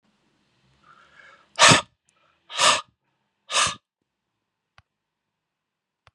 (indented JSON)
{
  "exhalation_length": "6.1 s",
  "exhalation_amplitude": 30524,
  "exhalation_signal_mean_std_ratio": 0.24,
  "survey_phase": "beta (2021-08-13 to 2022-03-07)",
  "age": "65+",
  "gender": "Male",
  "wearing_mask": "No",
  "symptom_cough_any": true,
  "symptom_runny_or_blocked_nose": true,
  "symptom_fever_high_temperature": true,
  "symptom_other": true,
  "symptom_onset": "3 days",
  "smoker_status": "Ex-smoker",
  "respiratory_condition_asthma": false,
  "respiratory_condition_other": false,
  "recruitment_source": "Test and Trace",
  "submission_delay": "2 days",
  "covid_test_result": "Positive",
  "covid_test_method": "RT-qPCR",
  "covid_ct_value": 23.7,
  "covid_ct_gene": "ORF1ab gene",
  "covid_ct_mean": 24.1,
  "covid_viral_load": "13000 copies/ml",
  "covid_viral_load_category": "Low viral load (10K-1M copies/ml)"
}